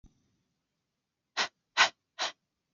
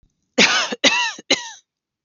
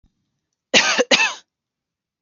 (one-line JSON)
{"exhalation_length": "2.7 s", "exhalation_amplitude": 11221, "exhalation_signal_mean_std_ratio": 0.23, "three_cough_length": "2.0 s", "three_cough_amplitude": 31992, "three_cough_signal_mean_std_ratio": 0.47, "cough_length": "2.2 s", "cough_amplitude": 30316, "cough_signal_mean_std_ratio": 0.37, "survey_phase": "alpha (2021-03-01 to 2021-08-12)", "age": "18-44", "gender": "Female", "wearing_mask": "No", "symptom_none": true, "smoker_status": "Never smoked", "respiratory_condition_asthma": false, "respiratory_condition_other": false, "recruitment_source": "REACT", "submission_delay": "1 day", "covid_test_result": "Negative", "covid_test_method": "RT-qPCR"}